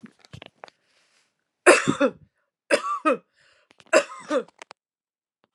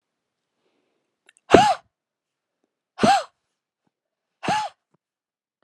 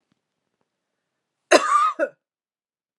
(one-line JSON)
{"three_cough_length": "5.5 s", "three_cough_amplitude": 32548, "three_cough_signal_mean_std_ratio": 0.3, "exhalation_length": "5.6 s", "exhalation_amplitude": 32768, "exhalation_signal_mean_std_ratio": 0.25, "cough_length": "3.0 s", "cough_amplitude": 31293, "cough_signal_mean_std_ratio": 0.3, "survey_phase": "beta (2021-08-13 to 2022-03-07)", "age": "45-64", "gender": "Female", "wearing_mask": "No", "symptom_none": true, "smoker_status": "Never smoked", "respiratory_condition_asthma": false, "respiratory_condition_other": false, "recruitment_source": "REACT", "submission_delay": "3 days", "covid_test_result": "Negative", "covid_test_method": "RT-qPCR"}